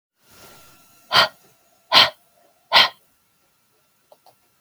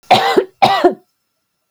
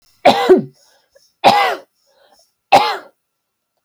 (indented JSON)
{
  "exhalation_length": "4.6 s",
  "exhalation_amplitude": 32768,
  "exhalation_signal_mean_std_ratio": 0.26,
  "cough_length": "1.7 s",
  "cough_amplitude": 32768,
  "cough_signal_mean_std_ratio": 0.49,
  "three_cough_length": "3.8 s",
  "three_cough_amplitude": 32768,
  "three_cough_signal_mean_std_ratio": 0.38,
  "survey_phase": "beta (2021-08-13 to 2022-03-07)",
  "age": "18-44",
  "gender": "Female",
  "wearing_mask": "No",
  "symptom_none": true,
  "symptom_onset": "6 days",
  "smoker_status": "Never smoked",
  "respiratory_condition_asthma": true,
  "respiratory_condition_other": false,
  "recruitment_source": "REACT",
  "submission_delay": "0 days",
  "covid_test_result": "Negative",
  "covid_test_method": "RT-qPCR",
  "influenza_a_test_result": "Negative",
  "influenza_b_test_result": "Negative"
}